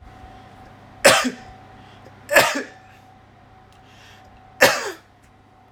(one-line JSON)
{"three_cough_length": "5.7 s", "three_cough_amplitude": 29968, "three_cough_signal_mean_std_ratio": 0.32, "survey_phase": "alpha (2021-03-01 to 2021-08-12)", "age": "18-44", "gender": "Male", "wearing_mask": "No", "symptom_none": true, "smoker_status": "Never smoked", "respiratory_condition_asthma": false, "respiratory_condition_other": false, "recruitment_source": "REACT", "submission_delay": "1 day", "covid_test_result": "Negative", "covid_test_method": "RT-qPCR"}